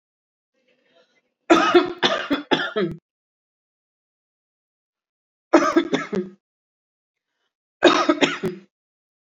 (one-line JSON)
{"three_cough_length": "9.2 s", "three_cough_amplitude": 28348, "three_cough_signal_mean_std_ratio": 0.35, "survey_phase": "beta (2021-08-13 to 2022-03-07)", "age": "45-64", "gender": "Female", "wearing_mask": "Yes", "symptom_none": true, "smoker_status": "Ex-smoker", "respiratory_condition_asthma": false, "respiratory_condition_other": false, "recruitment_source": "REACT", "submission_delay": "7 days", "covid_test_result": "Negative", "covid_test_method": "RT-qPCR", "influenza_a_test_result": "Negative", "influenza_b_test_result": "Negative"}